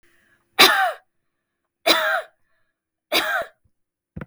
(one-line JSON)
{"three_cough_length": "4.3 s", "three_cough_amplitude": 32768, "three_cough_signal_mean_std_ratio": 0.36, "survey_phase": "beta (2021-08-13 to 2022-03-07)", "age": "45-64", "gender": "Female", "wearing_mask": "No", "symptom_none": true, "smoker_status": "Never smoked", "respiratory_condition_asthma": false, "respiratory_condition_other": false, "recruitment_source": "REACT", "submission_delay": "3 days", "covid_test_result": "Negative", "covid_test_method": "RT-qPCR", "influenza_a_test_result": "Negative", "influenza_b_test_result": "Negative"}